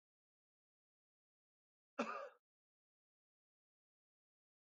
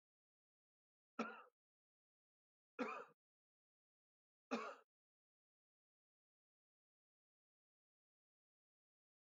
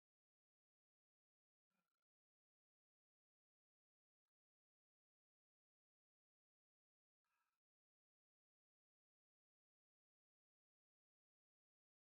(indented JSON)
{
  "cough_length": "4.8 s",
  "cough_amplitude": 1489,
  "cough_signal_mean_std_ratio": 0.18,
  "three_cough_length": "9.2 s",
  "three_cough_amplitude": 927,
  "three_cough_signal_mean_std_ratio": 0.2,
  "exhalation_length": "12.0 s",
  "exhalation_amplitude": 4,
  "exhalation_signal_mean_std_ratio": 0.11,
  "survey_phase": "beta (2021-08-13 to 2022-03-07)",
  "age": "45-64",
  "gender": "Male",
  "wearing_mask": "No",
  "symptom_none": true,
  "smoker_status": "Never smoked",
  "respiratory_condition_asthma": false,
  "respiratory_condition_other": false,
  "recruitment_source": "REACT",
  "submission_delay": "1 day",
  "covid_test_result": "Negative",
  "covid_test_method": "RT-qPCR",
  "influenza_a_test_result": "Negative",
  "influenza_b_test_result": "Negative"
}